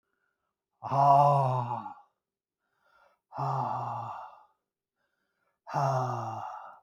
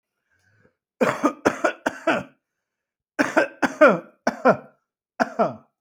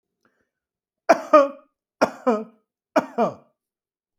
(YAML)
exhalation_length: 6.8 s
exhalation_amplitude: 13121
exhalation_signal_mean_std_ratio: 0.46
cough_length: 5.8 s
cough_amplitude: 25650
cough_signal_mean_std_ratio: 0.38
three_cough_length: 4.2 s
three_cough_amplitude: 26786
three_cough_signal_mean_std_ratio: 0.3
survey_phase: beta (2021-08-13 to 2022-03-07)
age: 45-64
gender: Male
wearing_mask: 'No'
symptom_none: true
smoker_status: Ex-smoker
respiratory_condition_asthma: false
respiratory_condition_other: false
recruitment_source: REACT
submission_delay: 2 days
covid_test_result: Negative
covid_test_method: RT-qPCR